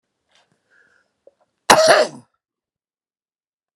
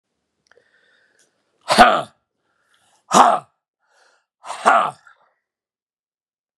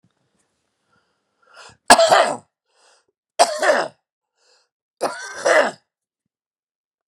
{"cough_length": "3.8 s", "cough_amplitude": 32768, "cough_signal_mean_std_ratio": 0.25, "exhalation_length": "6.6 s", "exhalation_amplitude": 32768, "exhalation_signal_mean_std_ratio": 0.27, "three_cough_length": "7.1 s", "three_cough_amplitude": 32768, "three_cough_signal_mean_std_ratio": 0.31, "survey_phase": "beta (2021-08-13 to 2022-03-07)", "age": "45-64", "gender": "Male", "wearing_mask": "No", "symptom_cough_any": true, "symptom_runny_or_blocked_nose": true, "symptom_abdominal_pain": true, "symptom_fatigue": true, "symptom_fever_high_temperature": true, "smoker_status": "Never smoked", "respiratory_condition_asthma": false, "respiratory_condition_other": false, "recruitment_source": "Test and Trace", "submission_delay": "2 days", "covid_test_result": "Positive", "covid_test_method": "RT-qPCR"}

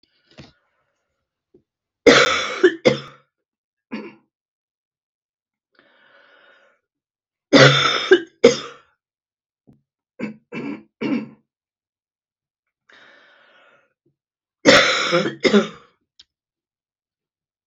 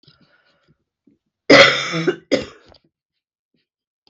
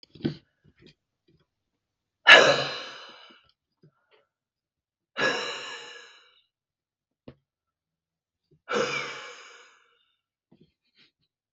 {"three_cough_length": "17.7 s", "three_cough_amplitude": 32768, "three_cough_signal_mean_std_ratio": 0.28, "cough_length": "4.1 s", "cough_amplitude": 32768, "cough_signal_mean_std_ratio": 0.28, "exhalation_length": "11.5 s", "exhalation_amplitude": 32768, "exhalation_signal_mean_std_ratio": 0.22, "survey_phase": "beta (2021-08-13 to 2022-03-07)", "age": "45-64", "gender": "Female", "wearing_mask": "No", "symptom_none": true, "smoker_status": "Ex-smoker", "respiratory_condition_asthma": true, "respiratory_condition_other": true, "recruitment_source": "REACT", "submission_delay": "2 days", "covid_test_result": "Negative", "covid_test_method": "RT-qPCR", "influenza_a_test_result": "Unknown/Void", "influenza_b_test_result": "Unknown/Void"}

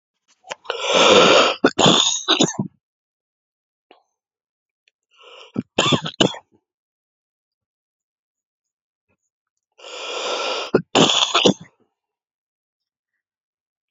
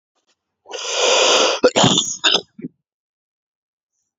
{"three_cough_length": "13.9 s", "three_cough_amplitude": 30713, "three_cough_signal_mean_std_ratio": 0.35, "cough_length": "4.2 s", "cough_amplitude": 30126, "cough_signal_mean_std_ratio": 0.47, "survey_phase": "beta (2021-08-13 to 2022-03-07)", "age": "45-64", "gender": "Male", "wearing_mask": "No", "symptom_cough_any": true, "symptom_fatigue": true, "symptom_headache": true, "symptom_onset": "12 days", "smoker_status": "Never smoked", "respiratory_condition_asthma": false, "respiratory_condition_other": true, "recruitment_source": "REACT", "submission_delay": "4 days", "covid_test_result": "Negative", "covid_test_method": "RT-qPCR"}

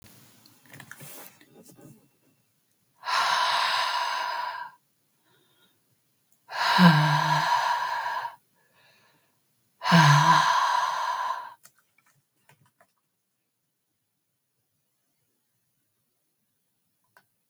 {"exhalation_length": "17.5 s", "exhalation_amplitude": 20410, "exhalation_signal_mean_std_ratio": 0.41, "survey_phase": "beta (2021-08-13 to 2022-03-07)", "age": "65+", "gender": "Female", "wearing_mask": "No", "symptom_none": true, "symptom_onset": "12 days", "smoker_status": "Never smoked", "respiratory_condition_asthma": false, "respiratory_condition_other": false, "recruitment_source": "REACT", "submission_delay": "1 day", "covid_test_result": "Negative", "covid_test_method": "RT-qPCR"}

